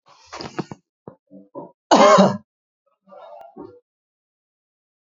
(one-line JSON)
{"cough_length": "5.0 s", "cough_amplitude": 27848, "cough_signal_mean_std_ratio": 0.27, "survey_phase": "alpha (2021-03-01 to 2021-08-12)", "age": "45-64", "gender": "Male", "wearing_mask": "No", "symptom_none": true, "smoker_status": "Current smoker (1 to 10 cigarettes per day)", "respiratory_condition_asthma": false, "respiratory_condition_other": false, "recruitment_source": "REACT", "submission_delay": "7 days", "covid_test_result": "Negative", "covid_test_method": "RT-qPCR"}